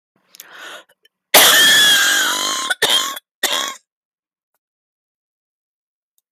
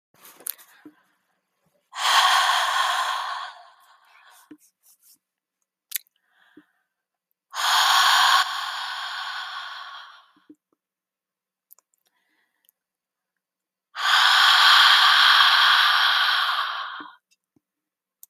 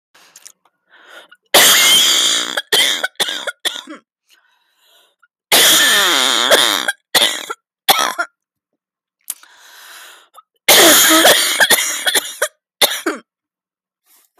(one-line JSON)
{"cough_length": "6.3 s", "cough_amplitude": 32768, "cough_signal_mean_std_ratio": 0.46, "exhalation_length": "18.3 s", "exhalation_amplitude": 26840, "exhalation_signal_mean_std_ratio": 0.47, "three_cough_length": "14.4 s", "three_cough_amplitude": 32768, "three_cough_signal_mean_std_ratio": 0.53, "survey_phase": "beta (2021-08-13 to 2022-03-07)", "age": "18-44", "gender": "Female", "wearing_mask": "No", "symptom_cough_any": true, "symptom_runny_or_blocked_nose": true, "symptom_shortness_of_breath": true, "symptom_onset": "12 days", "smoker_status": "Never smoked", "respiratory_condition_asthma": false, "respiratory_condition_other": true, "recruitment_source": "REACT", "submission_delay": "4 days", "covid_test_result": "Negative", "covid_test_method": "RT-qPCR"}